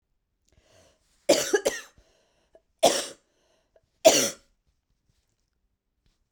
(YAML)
three_cough_length: 6.3 s
three_cough_amplitude: 23891
three_cough_signal_mean_std_ratio: 0.26
survey_phase: beta (2021-08-13 to 2022-03-07)
age: 45-64
gender: Female
wearing_mask: 'No'
symptom_cough_any: true
symptom_runny_or_blocked_nose: true
symptom_sore_throat: true
symptom_fatigue: true
symptom_headache: true
symptom_onset: 2 days
smoker_status: Never smoked
respiratory_condition_asthma: false
respiratory_condition_other: false
recruitment_source: Test and Trace
submission_delay: 1 day
covid_test_result: Positive
covid_test_method: RT-qPCR
covid_ct_value: 19.3
covid_ct_gene: ORF1ab gene
covid_ct_mean: 19.5
covid_viral_load: 390000 copies/ml
covid_viral_load_category: Low viral load (10K-1M copies/ml)